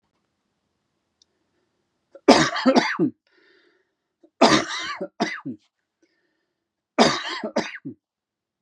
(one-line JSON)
{"three_cough_length": "8.6 s", "three_cough_amplitude": 32767, "three_cough_signal_mean_std_ratio": 0.33, "survey_phase": "beta (2021-08-13 to 2022-03-07)", "age": "45-64", "gender": "Male", "wearing_mask": "No", "symptom_cough_any": true, "symptom_runny_or_blocked_nose": true, "symptom_onset": "12 days", "smoker_status": "Never smoked", "respiratory_condition_asthma": false, "respiratory_condition_other": false, "recruitment_source": "REACT", "submission_delay": "3 days", "covid_test_result": "Negative", "covid_test_method": "RT-qPCR", "influenza_a_test_result": "Negative", "influenza_b_test_result": "Negative"}